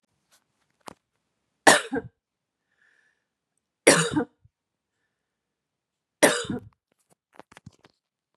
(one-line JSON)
{"three_cough_length": "8.4 s", "three_cough_amplitude": 30639, "three_cough_signal_mean_std_ratio": 0.22, "survey_phase": "beta (2021-08-13 to 2022-03-07)", "age": "45-64", "gender": "Female", "wearing_mask": "No", "symptom_none": true, "smoker_status": "Current smoker (e-cigarettes or vapes only)", "respiratory_condition_asthma": false, "respiratory_condition_other": false, "recruitment_source": "Test and Trace", "submission_delay": "0 days", "covid_test_result": "Negative", "covid_test_method": "LFT"}